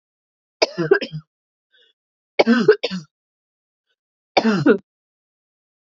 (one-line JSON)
{"three_cough_length": "5.8 s", "three_cough_amplitude": 30076, "three_cough_signal_mean_std_ratio": 0.32, "survey_phase": "beta (2021-08-13 to 2022-03-07)", "age": "18-44", "gender": "Female", "wearing_mask": "No", "symptom_cough_any": true, "symptom_runny_or_blocked_nose": true, "symptom_fatigue": true, "symptom_headache": true, "symptom_change_to_sense_of_smell_or_taste": true, "symptom_onset": "4 days", "smoker_status": "Never smoked", "respiratory_condition_asthma": false, "respiratory_condition_other": false, "recruitment_source": "Test and Trace", "submission_delay": "4 days", "covid_test_result": "Positive", "covid_test_method": "RT-qPCR"}